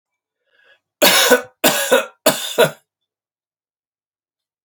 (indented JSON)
{
  "three_cough_length": "4.6 s",
  "three_cough_amplitude": 32767,
  "three_cough_signal_mean_std_ratio": 0.37,
  "survey_phase": "beta (2021-08-13 to 2022-03-07)",
  "age": "18-44",
  "gender": "Male",
  "wearing_mask": "No",
  "symptom_cough_any": true,
  "symptom_runny_or_blocked_nose": true,
  "symptom_sore_throat": true,
  "symptom_diarrhoea": true,
  "symptom_fatigue": true,
  "symptom_fever_high_temperature": true,
  "symptom_headache": true,
  "symptom_change_to_sense_of_smell_or_taste": true,
  "symptom_loss_of_taste": true,
  "smoker_status": "Never smoked",
  "respiratory_condition_asthma": false,
  "respiratory_condition_other": false,
  "recruitment_source": "Test and Trace",
  "submission_delay": "2 days",
  "covid_test_result": "Positive",
  "covid_test_method": "RT-qPCR",
  "covid_ct_value": 27.0,
  "covid_ct_gene": "ORF1ab gene",
  "covid_ct_mean": 27.6,
  "covid_viral_load": "890 copies/ml",
  "covid_viral_load_category": "Minimal viral load (< 10K copies/ml)"
}